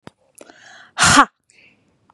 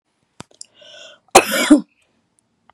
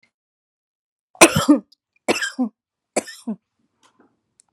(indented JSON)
{
  "exhalation_length": "2.1 s",
  "exhalation_amplitude": 32767,
  "exhalation_signal_mean_std_ratio": 0.29,
  "cough_length": "2.7 s",
  "cough_amplitude": 32768,
  "cough_signal_mean_std_ratio": 0.27,
  "three_cough_length": "4.5 s",
  "three_cough_amplitude": 32768,
  "three_cough_signal_mean_std_ratio": 0.26,
  "survey_phase": "beta (2021-08-13 to 2022-03-07)",
  "age": "18-44",
  "gender": "Female",
  "wearing_mask": "No",
  "symptom_none": true,
  "smoker_status": "Never smoked",
  "respiratory_condition_asthma": false,
  "respiratory_condition_other": false,
  "recruitment_source": "REACT",
  "submission_delay": "4 days",
  "covid_test_result": "Negative",
  "covid_test_method": "RT-qPCR",
  "influenza_a_test_result": "Negative",
  "influenza_b_test_result": "Negative"
}